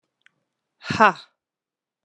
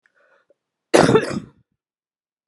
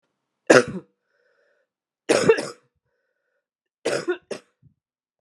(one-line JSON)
{"exhalation_length": "2.0 s", "exhalation_amplitude": 31336, "exhalation_signal_mean_std_ratio": 0.21, "cough_length": "2.5 s", "cough_amplitude": 32749, "cough_signal_mean_std_ratio": 0.29, "three_cough_length": "5.2 s", "three_cough_amplitude": 32767, "three_cough_signal_mean_std_ratio": 0.26, "survey_phase": "beta (2021-08-13 to 2022-03-07)", "age": "45-64", "gender": "Female", "wearing_mask": "No", "symptom_cough_any": true, "symptom_new_continuous_cough": true, "symptom_runny_or_blocked_nose": true, "symptom_sore_throat": true, "symptom_fatigue": true, "symptom_headache": true, "symptom_other": true, "symptom_onset": "3 days", "smoker_status": "Never smoked", "respiratory_condition_asthma": false, "respiratory_condition_other": false, "recruitment_source": "Test and Trace", "submission_delay": "2 days", "covid_test_result": "Positive", "covid_test_method": "RT-qPCR", "covid_ct_value": 19.8, "covid_ct_gene": "ORF1ab gene", "covid_ct_mean": 19.9, "covid_viral_load": "290000 copies/ml", "covid_viral_load_category": "Low viral load (10K-1M copies/ml)"}